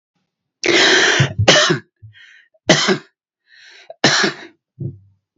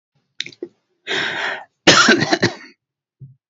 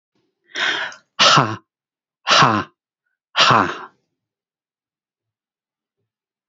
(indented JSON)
{
  "three_cough_length": "5.4 s",
  "three_cough_amplitude": 32342,
  "three_cough_signal_mean_std_ratio": 0.48,
  "cough_length": "3.5 s",
  "cough_amplitude": 32768,
  "cough_signal_mean_std_ratio": 0.41,
  "exhalation_length": "6.5 s",
  "exhalation_amplitude": 31087,
  "exhalation_signal_mean_std_ratio": 0.35,
  "survey_phase": "beta (2021-08-13 to 2022-03-07)",
  "age": "65+",
  "gender": "Male",
  "wearing_mask": "No",
  "symptom_none": true,
  "smoker_status": "Never smoked",
  "respiratory_condition_asthma": false,
  "respiratory_condition_other": false,
  "recruitment_source": "REACT",
  "submission_delay": "0 days",
  "covid_test_result": "Negative",
  "covid_test_method": "RT-qPCR"
}